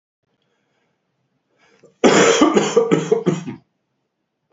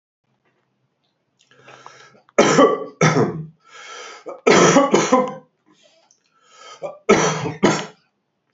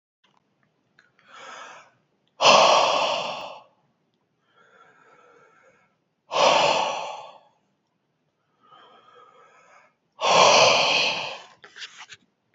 {
  "cough_length": "4.5 s",
  "cough_amplitude": 28315,
  "cough_signal_mean_std_ratio": 0.42,
  "three_cough_length": "8.5 s",
  "three_cough_amplitude": 31347,
  "three_cough_signal_mean_std_ratio": 0.42,
  "exhalation_length": "12.5 s",
  "exhalation_amplitude": 27253,
  "exhalation_signal_mean_std_ratio": 0.38,
  "survey_phase": "beta (2021-08-13 to 2022-03-07)",
  "age": "45-64",
  "gender": "Male",
  "wearing_mask": "No",
  "symptom_cough_any": true,
  "symptom_sore_throat": true,
  "symptom_headache": true,
  "smoker_status": "Never smoked",
  "respiratory_condition_asthma": false,
  "respiratory_condition_other": false,
  "recruitment_source": "Test and Trace",
  "submission_delay": "2 days",
  "covid_test_result": "Positive",
  "covid_test_method": "RT-qPCR",
  "covid_ct_value": 20.3,
  "covid_ct_gene": "ORF1ab gene",
  "covid_ct_mean": 21.1,
  "covid_viral_load": "120000 copies/ml",
  "covid_viral_load_category": "Low viral load (10K-1M copies/ml)"
}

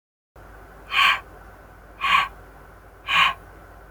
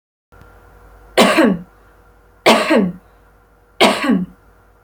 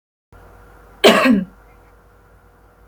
{
  "exhalation_length": "3.9 s",
  "exhalation_amplitude": 20734,
  "exhalation_signal_mean_std_ratio": 0.42,
  "three_cough_length": "4.8 s",
  "three_cough_amplitude": 31269,
  "three_cough_signal_mean_std_ratio": 0.44,
  "cough_length": "2.9 s",
  "cough_amplitude": 30081,
  "cough_signal_mean_std_ratio": 0.33,
  "survey_phase": "beta (2021-08-13 to 2022-03-07)",
  "age": "18-44",
  "gender": "Female",
  "wearing_mask": "No",
  "symptom_none": true,
  "smoker_status": "Ex-smoker",
  "respiratory_condition_asthma": false,
  "respiratory_condition_other": false,
  "recruitment_source": "REACT",
  "submission_delay": "1 day",
  "covid_test_result": "Negative",
  "covid_test_method": "RT-qPCR"
}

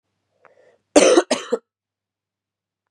{
  "cough_length": "2.9 s",
  "cough_amplitude": 32767,
  "cough_signal_mean_std_ratio": 0.28,
  "survey_phase": "beta (2021-08-13 to 2022-03-07)",
  "age": "18-44",
  "gender": "Female",
  "wearing_mask": "No",
  "symptom_cough_any": true,
  "symptom_runny_or_blocked_nose": true,
  "symptom_shortness_of_breath": true,
  "symptom_sore_throat": true,
  "symptom_fatigue": true,
  "symptom_fever_high_temperature": true,
  "symptom_headache": true,
  "smoker_status": "Never smoked",
  "respiratory_condition_asthma": true,
  "respiratory_condition_other": false,
  "recruitment_source": "Test and Trace",
  "submission_delay": "2 days",
  "covid_test_result": "Positive",
  "covid_test_method": "LFT"
}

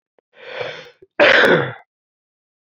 {
  "cough_length": "2.6 s",
  "cough_amplitude": 29395,
  "cough_signal_mean_std_ratio": 0.39,
  "survey_phase": "alpha (2021-03-01 to 2021-08-12)",
  "age": "18-44",
  "gender": "Male",
  "wearing_mask": "No",
  "symptom_cough_any": true,
  "symptom_fatigue": true,
  "symptom_headache": true,
  "symptom_onset": "3 days",
  "smoker_status": "Never smoked",
  "respiratory_condition_asthma": true,
  "respiratory_condition_other": false,
  "recruitment_source": "Test and Trace",
  "submission_delay": "1 day",
  "covid_test_result": "Positive",
  "covid_test_method": "RT-qPCR",
  "covid_ct_value": 24.5,
  "covid_ct_gene": "ORF1ab gene"
}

